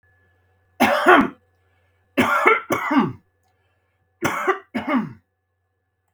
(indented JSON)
{
  "three_cough_length": "6.1 s",
  "three_cough_amplitude": 32767,
  "three_cough_signal_mean_std_ratio": 0.43,
  "survey_phase": "beta (2021-08-13 to 2022-03-07)",
  "age": "18-44",
  "gender": "Male",
  "wearing_mask": "No",
  "symptom_none": true,
  "smoker_status": "Never smoked",
  "respiratory_condition_asthma": false,
  "respiratory_condition_other": false,
  "recruitment_source": "REACT",
  "submission_delay": "0 days",
  "covid_test_result": "Negative",
  "covid_test_method": "RT-qPCR",
  "influenza_a_test_result": "Negative",
  "influenza_b_test_result": "Negative"
}